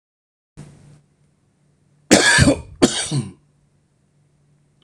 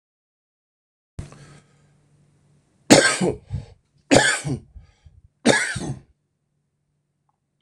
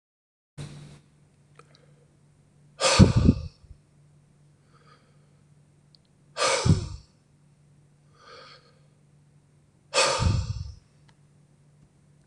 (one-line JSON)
{"cough_length": "4.8 s", "cough_amplitude": 26028, "cough_signal_mean_std_ratio": 0.32, "three_cough_length": "7.6 s", "three_cough_amplitude": 26028, "three_cough_signal_mean_std_ratio": 0.3, "exhalation_length": "12.3 s", "exhalation_amplitude": 23902, "exhalation_signal_mean_std_ratio": 0.29, "survey_phase": "beta (2021-08-13 to 2022-03-07)", "age": "45-64", "gender": "Male", "wearing_mask": "No", "symptom_none": true, "smoker_status": "Never smoked", "respiratory_condition_asthma": false, "respiratory_condition_other": false, "recruitment_source": "REACT", "submission_delay": "0 days", "covid_test_result": "Negative", "covid_test_method": "RT-qPCR"}